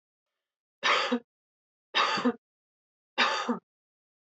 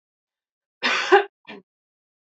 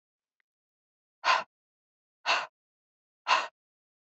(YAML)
three_cough_length: 4.4 s
three_cough_amplitude: 9049
three_cough_signal_mean_std_ratio: 0.4
cough_length: 2.2 s
cough_amplitude: 26616
cough_signal_mean_std_ratio: 0.29
exhalation_length: 4.2 s
exhalation_amplitude: 9259
exhalation_signal_mean_std_ratio: 0.27
survey_phase: beta (2021-08-13 to 2022-03-07)
age: 18-44
gender: Female
wearing_mask: 'No'
symptom_none: true
smoker_status: Never smoked
respiratory_condition_asthma: false
respiratory_condition_other: false
recruitment_source: REACT
submission_delay: 0 days
covid_test_result: Negative
covid_test_method: RT-qPCR